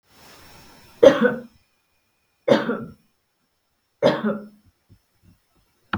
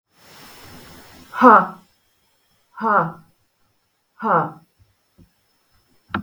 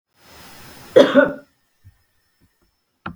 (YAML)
three_cough_length: 6.0 s
three_cough_amplitude: 32768
three_cough_signal_mean_std_ratio: 0.29
exhalation_length: 6.2 s
exhalation_amplitude: 32768
exhalation_signal_mean_std_ratio: 0.29
cough_length: 3.2 s
cough_amplitude: 32768
cough_signal_mean_std_ratio: 0.26
survey_phase: beta (2021-08-13 to 2022-03-07)
age: 45-64
gender: Female
wearing_mask: 'No'
symptom_none: true
smoker_status: Never smoked
respiratory_condition_asthma: false
respiratory_condition_other: false
recruitment_source: REACT
submission_delay: 2 days
covid_test_result: Negative
covid_test_method: RT-qPCR
influenza_a_test_result: Negative
influenza_b_test_result: Negative